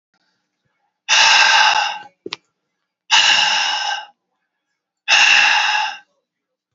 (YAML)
exhalation_length: 6.7 s
exhalation_amplitude: 30696
exhalation_signal_mean_std_ratio: 0.53
survey_phase: beta (2021-08-13 to 2022-03-07)
age: 65+
gender: Male
wearing_mask: 'No'
symptom_cough_any: true
symptom_runny_or_blocked_nose: true
smoker_status: Never smoked
respiratory_condition_asthma: false
respiratory_condition_other: false
recruitment_source: Test and Trace
submission_delay: 2 days
covid_test_result: Positive
covid_test_method: RT-qPCR
covid_ct_value: 17.8
covid_ct_gene: ORF1ab gene
covid_ct_mean: 18.4
covid_viral_load: 920000 copies/ml
covid_viral_load_category: Low viral load (10K-1M copies/ml)